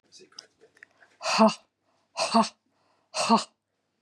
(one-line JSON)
{"exhalation_length": "4.0 s", "exhalation_amplitude": 15367, "exhalation_signal_mean_std_ratio": 0.34, "survey_phase": "beta (2021-08-13 to 2022-03-07)", "age": "45-64", "gender": "Female", "wearing_mask": "No", "symptom_none": true, "smoker_status": "Ex-smoker", "respiratory_condition_asthma": false, "respiratory_condition_other": false, "recruitment_source": "REACT", "submission_delay": "2 days", "covid_test_result": "Negative", "covid_test_method": "RT-qPCR", "influenza_a_test_result": "Negative", "influenza_b_test_result": "Negative"}